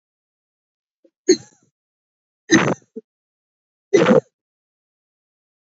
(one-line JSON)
{"three_cough_length": "5.6 s", "three_cough_amplitude": 28774, "three_cough_signal_mean_std_ratio": 0.25, "survey_phase": "beta (2021-08-13 to 2022-03-07)", "age": "45-64", "gender": "Female", "wearing_mask": "No", "symptom_runny_or_blocked_nose": true, "symptom_sore_throat": true, "smoker_status": "Never smoked", "respiratory_condition_asthma": false, "respiratory_condition_other": false, "recruitment_source": "Test and Trace", "submission_delay": "0 days", "covid_test_result": "Positive", "covid_test_method": "RT-qPCR", "covid_ct_value": 17.5, "covid_ct_gene": "ORF1ab gene", "covid_ct_mean": 18.2, "covid_viral_load": "1100000 copies/ml", "covid_viral_load_category": "High viral load (>1M copies/ml)"}